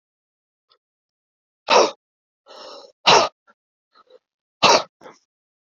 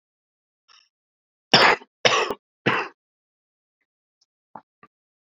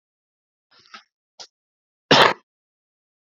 {"exhalation_length": "5.6 s", "exhalation_amplitude": 30399, "exhalation_signal_mean_std_ratio": 0.26, "three_cough_length": "5.4 s", "three_cough_amplitude": 28825, "three_cough_signal_mean_std_ratio": 0.26, "cough_length": "3.3 s", "cough_amplitude": 32767, "cough_signal_mean_std_ratio": 0.2, "survey_phase": "beta (2021-08-13 to 2022-03-07)", "age": "18-44", "gender": "Male", "wearing_mask": "Yes", "symptom_cough_any": true, "symptom_runny_or_blocked_nose": true, "symptom_sore_throat": true, "symptom_fatigue": true, "symptom_fever_high_temperature": true, "symptom_headache": true, "symptom_change_to_sense_of_smell_or_taste": true, "symptom_loss_of_taste": true, "symptom_onset": "4 days", "smoker_status": "Never smoked", "respiratory_condition_asthma": true, "respiratory_condition_other": false, "recruitment_source": "Test and Trace", "submission_delay": "1 day", "covid_test_result": "Positive", "covid_test_method": "ePCR"}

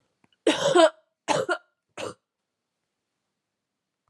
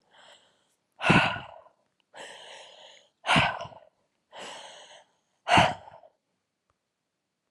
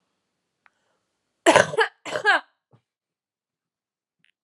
{"three_cough_length": "4.1 s", "three_cough_amplitude": 15721, "three_cough_signal_mean_std_ratio": 0.31, "exhalation_length": "7.5 s", "exhalation_amplitude": 16856, "exhalation_signal_mean_std_ratio": 0.3, "cough_length": "4.4 s", "cough_amplitude": 32291, "cough_signal_mean_std_ratio": 0.25, "survey_phase": "alpha (2021-03-01 to 2021-08-12)", "age": "18-44", "gender": "Male", "wearing_mask": "No", "symptom_cough_any": true, "symptom_abdominal_pain": true, "symptom_fatigue": true, "symptom_fever_high_temperature": true, "symptom_headache": true, "symptom_onset": "1 day", "smoker_status": "Never smoked", "respiratory_condition_asthma": false, "respiratory_condition_other": false, "recruitment_source": "Test and Trace", "submission_delay": "0 days", "covid_test_result": "Positive", "covid_test_method": "RT-qPCR"}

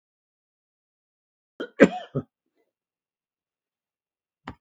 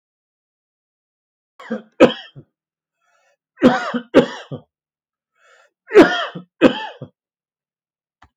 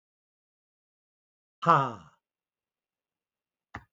{"cough_length": "4.6 s", "cough_amplitude": 30813, "cough_signal_mean_std_ratio": 0.14, "three_cough_length": "8.4 s", "three_cough_amplitude": 32768, "three_cough_signal_mean_std_ratio": 0.26, "exhalation_length": "3.9 s", "exhalation_amplitude": 17238, "exhalation_signal_mean_std_ratio": 0.18, "survey_phase": "beta (2021-08-13 to 2022-03-07)", "age": "65+", "gender": "Male", "wearing_mask": "No", "symptom_none": true, "smoker_status": "Ex-smoker", "respiratory_condition_asthma": false, "respiratory_condition_other": false, "recruitment_source": "REACT", "submission_delay": "3 days", "covid_test_result": "Negative", "covid_test_method": "RT-qPCR", "influenza_a_test_result": "Negative", "influenza_b_test_result": "Negative"}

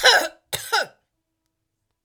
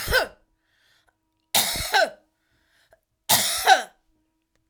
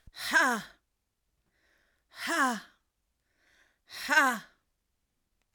{"cough_length": "2.0 s", "cough_amplitude": 27060, "cough_signal_mean_std_ratio": 0.35, "three_cough_length": "4.7 s", "three_cough_amplitude": 27140, "three_cough_signal_mean_std_ratio": 0.38, "exhalation_length": "5.5 s", "exhalation_amplitude": 10532, "exhalation_signal_mean_std_ratio": 0.34, "survey_phase": "alpha (2021-03-01 to 2021-08-12)", "age": "45-64", "gender": "Female", "wearing_mask": "No", "symptom_none": true, "symptom_onset": "6 days", "smoker_status": "Ex-smoker", "respiratory_condition_asthma": true, "respiratory_condition_other": false, "recruitment_source": "REACT", "submission_delay": "3 days", "covid_test_result": "Negative", "covid_test_method": "RT-qPCR"}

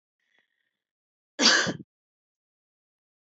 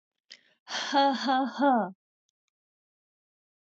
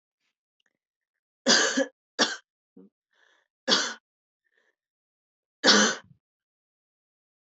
{"cough_length": "3.2 s", "cough_amplitude": 16471, "cough_signal_mean_std_ratio": 0.25, "exhalation_length": "3.7 s", "exhalation_amplitude": 8577, "exhalation_signal_mean_std_ratio": 0.43, "three_cough_length": "7.5 s", "three_cough_amplitude": 20708, "three_cough_signal_mean_std_ratio": 0.28, "survey_phase": "beta (2021-08-13 to 2022-03-07)", "age": "18-44", "gender": "Female", "wearing_mask": "No", "symptom_cough_any": true, "symptom_sore_throat": true, "symptom_headache": true, "symptom_other": true, "smoker_status": "Never smoked", "respiratory_condition_asthma": false, "respiratory_condition_other": false, "recruitment_source": "Test and Trace", "submission_delay": "1 day", "covid_test_result": "Positive", "covid_test_method": "ePCR"}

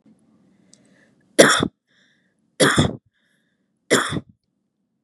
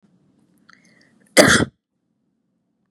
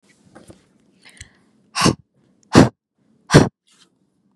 {"three_cough_length": "5.0 s", "three_cough_amplitude": 32768, "three_cough_signal_mean_std_ratio": 0.3, "cough_length": "2.9 s", "cough_amplitude": 32768, "cough_signal_mean_std_ratio": 0.24, "exhalation_length": "4.4 s", "exhalation_amplitude": 32768, "exhalation_signal_mean_std_ratio": 0.24, "survey_phase": "beta (2021-08-13 to 2022-03-07)", "age": "18-44", "gender": "Female", "wearing_mask": "No", "symptom_none": true, "symptom_onset": "12 days", "smoker_status": "Never smoked", "respiratory_condition_asthma": true, "respiratory_condition_other": false, "recruitment_source": "REACT", "submission_delay": "1 day", "covid_test_result": "Negative", "covid_test_method": "RT-qPCR", "influenza_a_test_result": "Negative", "influenza_b_test_result": "Negative"}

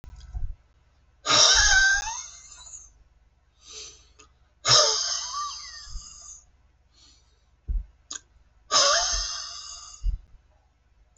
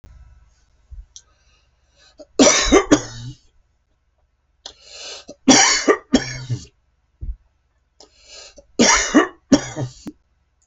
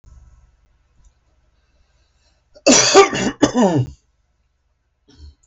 {"exhalation_length": "11.2 s", "exhalation_amplitude": 20489, "exhalation_signal_mean_std_ratio": 0.43, "three_cough_length": "10.7 s", "three_cough_amplitude": 32550, "three_cough_signal_mean_std_ratio": 0.35, "cough_length": "5.5 s", "cough_amplitude": 32550, "cough_signal_mean_std_ratio": 0.33, "survey_phase": "beta (2021-08-13 to 2022-03-07)", "age": "65+", "gender": "Male", "wearing_mask": "No", "symptom_none": true, "smoker_status": "Ex-smoker", "respiratory_condition_asthma": false, "respiratory_condition_other": false, "recruitment_source": "REACT", "submission_delay": "4 days", "covid_test_result": "Negative", "covid_test_method": "RT-qPCR"}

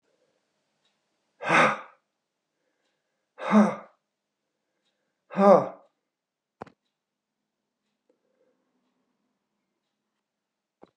{"exhalation_length": "11.0 s", "exhalation_amplitude": 19580, "exhalation_signal_mean_std_ratio": 0.21, "survey_phase": "beta (2021-08-13 to 2022-03-07)", "age": "65+", "gender": "Male", "wearing_mask": "No", "symptom_none": true, "smoker_status": "Ex-smoker", "respiratory_condition_asthma": false, "respiratory_condition_other": true, "recruitment_source": "REACT", "submission_delay": "4 days", "covid_test_result": "Negative", "covid_test_method": "RT-qPCR", "influenza_a_test_result": "Negative", "influenza_b_test_result": "Negative"}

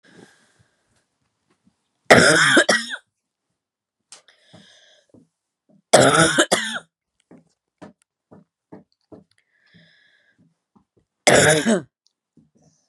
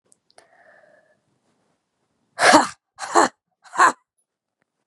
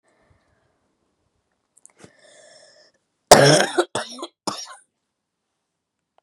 {"three_cough_length": "12.9 s", "three_cough_amplitude": 32768, "three_cough_signal_mean_std_ratio": 0.3, "exhalation_length": "4.9 s", "exhalation_amplitude": 32767, "exhalation_signal_mean_std_ratio": 0.27, "cough_length": "6.2 s", "cough_amplitude": 32768, "cough_signal_mean_std_ratio": 0.22, "survey_phase": "beta (2021-08-13 to 2022-03-07)", "age": "45-64", "gender": "Female", "wearing_mask": "No", "symptom_new_continuous_cough": true, "symptom_sore_throat": true, "symptom_fever_high_temperature": true, "symptom_headache": true, "symptom_onset": "11 days", "smoker_status": "Never smoked", "respiratory_condition_asthma": true, "respiratory_condition_other": false, "recruitment_source": "REACT", "submission_delay": "4 days", "covid_test_result": "Negative", "covid_test_method": "RT-qPCR", "influenza_a_test_result": "Unknown/Void", "influenza_b_test_result": "Unknown/Void"}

